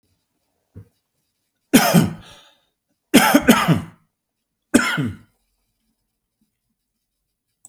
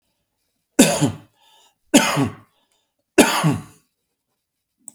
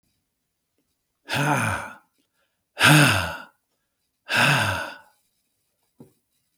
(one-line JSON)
{"cough_length": "7.7 s", "cough_amplitude": 32768, "cough_signal_mean_std_ratio": 0.31, "three_cough_length": "4.9 s", "three_cough_amplitude": 32768, "three_cough_signal_mean_std_ratio": 0.34, "exhalation_length": "6.6 s", "exhalation_amplitude": 32666, "exhalation_signal_mean_std_ratio": 0.38, "survey_phase": "beta (2021-08-13 to 2022-03-07)", "age": "65+", "gender": "Male", "wearing_mask": "No", "symptom_none": true, "smoker_status": "Never smoked", "respiratory_condition_asthma": false, "respiratory_condition_other": false, "recruitment_source": "REACT", "submission_delay": "1 day", "covid_test_result": "Negative", "covid_test_method": "RT-qPCR", "influenza_a_test_result": "Negative", "influenza_b_test_result": "Negative"}